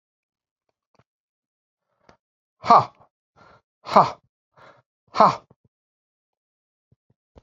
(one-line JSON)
{"exhalation_length": "7.4 s", "exhalation_amplitude": 32767, "exhalation_signal_mean_std_ratio": 0.18, "survey_phase": "beta (2021-08-13 to 2022-03-07)", "age": "45-64", "gender": "Male", "wearing_mask": "No", "symptom_none": true, "smoker_status": "Never smoked", "respiratory_condition_asthma": false, "respiratory_condition_other": false, "recruitment_source": "REACT", "submission_delay": "2 days", "covid_test_result": "Negative", "covid_test_method": "RT-qPCR"}